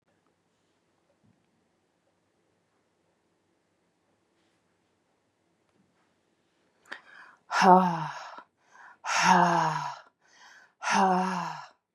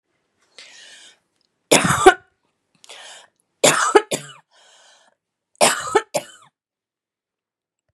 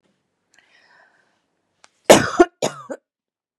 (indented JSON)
{
  "exhalation_length": "11.9 s",
  "exhalation_amplitude": 21702,
  "exhalation_signal_mean_std_ratio": 0.31,
  "three_cough_length": "7.9 s",
  "three_cough_amplitude": 32768,
  "three_cough_signal_mean_std_ratio": 0.28,
  "cough_length": "3.6 s",
  "cough_amplitude": 32768,
  "cough_signal_mean_std_ratio": 0.22,
  "survey_phase": "beta (2021-08-13 to 2022-03-07)",
  "age": "45-64",
  "gender": "Female",
  "wearing_mask": "No",
  "symptom_other": true,
  "symptom_onset": "2 days",
  "smoker_status": "Ex-smoker",
  "respiratory_condition_asthma": false,
  "respiratory_condition_other": false,
  "recruitment_source": "Test and Trace",
  "submission_delay": "1 day",
  "covid_test_result": "Positive",
  "covid_test_method": "ePCR"
}